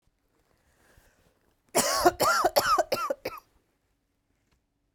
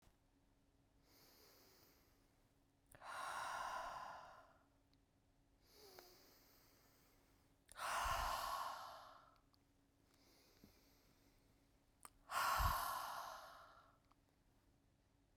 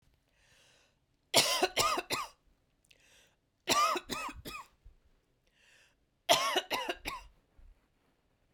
{"cough_length": "4.9 s", "cough_amplitude": 15453, "cough_signal_mean_std_ratio": 0.39, "exhalation_length": "15.4 s", "exhalation_amplitude": 1674, "exhalation_signal_mean_std_ratio": 0.42, "three_cough_length": "8.5 s", "three_cough_amplitude": 12887, "three_cough_signal_mean_std_ratio": 0.37, "survey_phase": "beta (2021-08-13 to 2022-03-07)", "age": "45-64", "gender": "Female", "wearing_mask": "No", "symptom_cough_any": true, "symptom_runny_or_blocked_nose": true, "symptom_sore_throat": true, "symptom_fatigue": true, "symptom_fever_high_temperature": true, "symptom_headache": true, "symptom_other": true, "symptom_onset": "4 days", "smoker_status": "Never smoked", "respiratory_condition_asthma": false, "respiratory_condition_other": false, "recruitment_source": "Test and Trace", "submission_delay": "2 days", "covid_test_result": "Positive", "covid_test_method": "RT-qPCR", "covid_ct_value": 20.9, "covid_ct_gene": "ORF1ab gene", "covid_ct_mean": 21.3, "covid_viral_load": "100000 copies/ml", "covid_viral_load_category": "Low viral load (10K-1M copies/ml)"}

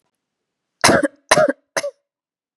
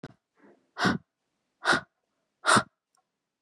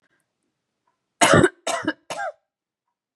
{"cough_length": "2.6 s", "cough_amplitude": 32768, "cough_signal_mean_std_ratio": 0.35, "exhalation_length": "3.4 s", "exhalation_amplitude": 13973, "exhalation_signal_mean_std_ratio": 0.3, "three_cough_length": "3.2 s", "three_cough_amplitude": 31895, "three_cough_signal_mean_std_ratio": 0.31, "survey_phase": "beta (2021-08-13 to 2022-03-07)", "age": "18-44", "gender": "Female", "wearing_mask": "No", "symptom_none": true, "smoker_status": "Never smoked", "respiratory_condition_asthma": false, "respiratory_condition_other": false, "recruitment_source": "REACT", "submission_delay": "2 days", "covid_test_result": "Negative", "covid_test_method": "RT-qPCR", "influenza_a_test_result": "Negative", "influenza_b_test_result": "Negative"}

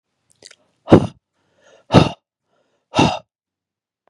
{"exhalation_length": "4.1 s", "exhalation_amplitude": 32768, "exhalation_signal_mean_std_ratio": 0.25, "survey_phase": "beta (2021-08-13 to 2022-03-07)", "age": "18-44", "gender": "Male", "wearing_mask": "No", "symptom_cough_any": true, "symptom_onset": "12 days", "smoker_status": "Never smoked", "respiratory_condition_asthma": false, "respiratory_condition_other": false, "recruitment_source": "REACT", "submission_delay": "1 day", "covid_test_result": "Negative", "covid_test_method": "RT-qPCR", "influenza_a_test_result": "Negative", "influenza_b_test_result": "Negative"}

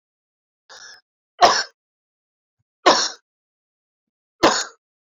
{"three_cough_length": "5.0 s", "three_cough_amplitude": 29842, "three_cough_signal_mean_std_ratio": 0.27, "survey_phase": "beta (2021-08-13 to 2022-03-07)", "age": "45-64", "gender": "Male", "wearing_mask": "No", "symptom_cough_any": true, "symptom_shortness_of_breath": true, "symptom_sore_throat": true, "symptom_fatigue": true, "symptom_fever_high_temperature": true, "symptom_change_to_sense_of_smell_or_taste": true, "symptom_onset": "6 days", "smoker_status": "Ex-smoker", "respiratory_condition_asthma": false, "respiratory_condition_other": false, "recruitment_source": "Test and Trace", "submission_delay": "2 days", "covid_test_result": "Positive", "covid_test_method": "RT-qPCR", "covid_ct_value": 20.7, "covid_ct_gene": "ORF1ab gene", "covid_ct_mean": 21.2, "covid_viral_load": "110000 copies/ml", "covid_viral_load_category": "Low viral load (10K-1M copies/ml)"}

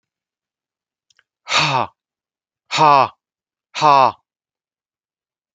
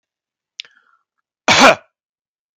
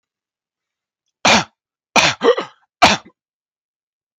{"exhalation_length": "5.5 s", "exhalation_amplitude": 30981, "exhalation_signal_mean_std_ratio": 0.32, "cough_length": "2.6 s", "cough_amplitude": 32768, "cough_signal_mean_std_ratio": 0.26, "three_cough_length": "4.2 s", "three_cough_amplitude": 32768, "three_cough_signal_mean_std_ratio": 0.31, "survey_phase": "beta (2021-08-13 to 2022-03-07)", "age": "45-64", "gender": "Male", "wearing_mask": "No", "symptom_none": true, "smoker_status": "Never smoked", "respiratory_condition_asthma": false, "respiratory_condition_other": false, "recruitment_source": "REACT", "submission_delay": "1 day", "covid_test_result": "Negative", "covid_test_method": "RT-qPCR"}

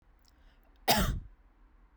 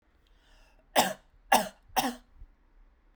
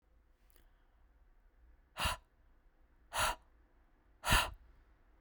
{"cough_length": "2.0 s", "cough_amplitude": 8689, "cough_signal_mean_std_ratio": 0.35, "three_cough_length": "3.2 s", "three_cough_amplitude": 14660, "three_cough_signal_mean_std_ratio": 0.3, "exhalation_length": "5.2 s", "exhalation_amplitude": 5654, "exhalation_signal_mean_std_ratio": 0.3, "survey_phase": "beta (2021-08-13 to 2022-03-07)", "age": "18-44", "gender": "Female", "wearing_mask": "No", "symptom_none": true, "smoker_status": "Prefer not to say", "respiratory_condition_asthma": false, "respiratory_condition_other": false, "recruitment_source": "Test and Trace", "submission_delay": "0 days", "covid_test_result": "Negative", "covid_test_method": "LFT"}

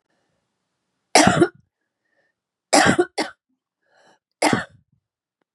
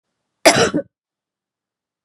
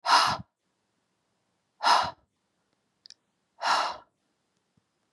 {"three_cough_length": "5.5 s", "three_cough_amplitude": 32064, "three_cough_signal_mean_std_ratio": 0.3, "cough_length": "2.0 s", "cough_amplitude": 32768, "cough_signal_mean_std_ratio": 0.29, "exhalation_length": "5.1 s", "exhalation_amplitude": 14939, "exhalation_signal_mean_std_ratio": 0.32, "survey_phase": "beta (2021-08-13 to 2022-03-07)", "age": "45-64", "gender": "Female", "wearing_mask": "No", "symptom_cough_any": true, "symptom_runny_or_blocked_nose": true, "symptom_shortness_of_breath": true, "symptom_sore_throat": true, "symptom_abdominal_pain": true, "symptom_fatigue": true, "symptom_headache": true, "symptom_onset": "2 days", "smoker_status": "Current smoker (e-cigarettes or vapes only)", "respiratory_condition_asthma": true, "respiratory_condition_other": false, "recruitment_source": "Test and Trace", "submission_delay": "0 days", "covid_test_result": "Positive", "covid_test_method": "RT-qPCR", "covid_ct_value": 23.0, "covid_ct_gene": "N gene"}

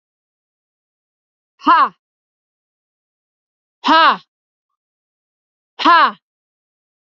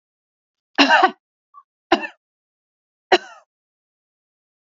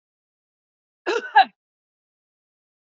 {"exhalation_length": "7.2 s", "exhalation_amplitude": 29551, "exhalation_signal_mean_std_ratio": 0.27, "three_cough_length": "4.6 s", "three_cough_amplitude": 30783, "three_cough_signal_mean_std_ratio": 0.24, "cough_length": "2.8 s", "cough_amplitude": 26702, "cough_signal_mean_std_ratio": 0.21, "survey_phase": "beta (2021-08-13 to 2022-03-07)", "age": "18-44", "gender": "Female", "wearing_mask": "No", "symptom_sore_throat": true, "smoker_status": "Ex-smoker", "respiratory_condition_asthma": false, "respiratory_condition_other": false, "recruitment_source": "REACT", "submission_delay": "1 day", "covid_test_result": "Negative", "covid_test_method": "RT-qPCR", "influenza_a_test_result": "Negative", "influenza_b_test_result": "Negative"}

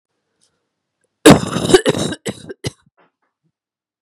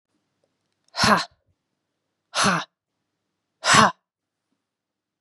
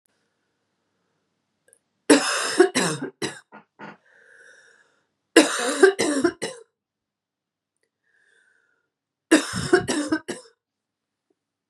{"cough_length": "4.0 s", "cough_amplitude": 32768, "cough_signal_mean_std_ratio": 0.29, "exhalation_length": "5.2 s", "exhalation_amplitude": 29656, "exhalation_signal_mean_std_ratio": 0.29, "three_cough_length": "11.7 s", "three_cough_amplitude": 32535, "three_cough_signal_mean_std_ratio": 0.32, "survey_phase": "beta (2021-08-13 to 2022-03-07)", "age": "45-64", "gender": "Female", "wearing_mask": "No", "symptom_runny_or_blocked_nose": true, "symptom_fatigue": true, "symptom_headache": true, "symptom_change_to_sense_of_smell_or_taste": true, "symptom_loss_of_taste": true, "symptom_onset": "5 days", "smoker_status": "Never smoked", "respiratory_condition_asthma": false, "respiratory_condition_other": false, "recruitment_source": "Test and Trace", "submission_delay": "2 days", "covid_test_result": "Positive", "covid_test_method": "RT-qPCR", "covid_ct_value": 25.6, "covid_ct_gene": "N gene"}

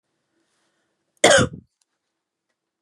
{"cough_length": "2.8 s", "cough_amplitude": 32764, "cough_signal_mean_std_ratio": 0.23, "survey_phase": "beta (2021-08-13 to 2022-03-07)", "age": "18-44", "gender": "Female", "wearing_mask": "No", "symptom_change_to_sense_of_smell_or_taste": true, "smoker_status": "Ex-smoker", "respiratory_condition_asthma": false, "respiratory_condition_other": false, "recruitment_source": "REACT", "submission_delay": "1 day", "covid_test_result": "Negative", "covid_test_method": "RT-qPCR", "influenza_a_test_result": "Negative", "influenza_b_test_result": "Negative"}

